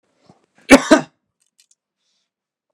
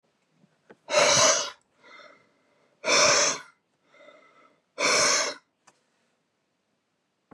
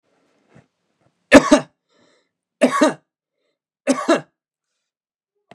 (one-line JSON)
{"cough_length": "2.7 s", "cough_amplitude": 32768, "cough_signal_mean_std_ratio": 0.21, "exhalation_length": "7.3 s", "exhalation_amplitude": 14882, "exhalation_signal_mean_std_ratio": 0.4, "three_cough_length": "5.5 s", "three_cough_amplitude": 32768, "three_cough_signal_mean_std_ratio": 0.26, "survey_phase": "beta (2021-08-13 to 2022-03-07)", "age": "65+", "gender": "Male", "wearing_mask": "No", "symptom_none": true, "smoker_status": "Never smoked", "respiratory_condition_asthma": false, "respiratory_condition_other": false, "recruitment_source": "REACT", "submission_delay": "2 days", "covid_test_result": "Negative", "covid_test_method": "RT-qPCR", "influenza_a_test_result": "Negative", "influenza_b_test_result": "Negative"}